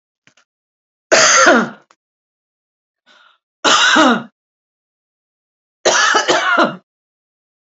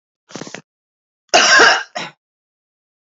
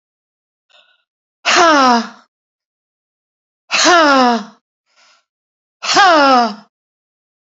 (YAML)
three_cough_length: 7.8 s
three_cough_amplitude: 32313
three_cough_signal_mean_std_ratio: 0.42
cough_length: 3.2 s
cough_amplitude: 32768
cough_signal_mean_std_ratio: 0.35
exhalation_length: 7.6 s
exhalation_amplitude: 32768
exhalation_signal_mean_std_ratio: 0.42
survey_phase: beta (2021-08-13 to 2022-03-07)
age: 65+
gender: Female
wearing_mask: 'No'
symptom_cough_any: true
symptom_shortness_of_breath: true
symptom_fatigue: true
symptom_onset: 12 days
smoker_status: Ex-smoker
respiratory_condition_asthma: false
respiratory_condition_other: false
recruitment_source: REACT
submission_delay: 2 days
covid_test_result: Negative
covid_test_method: RT-qPCR
influenza_a_test_result: Negative
influenza_b_test_result: Negative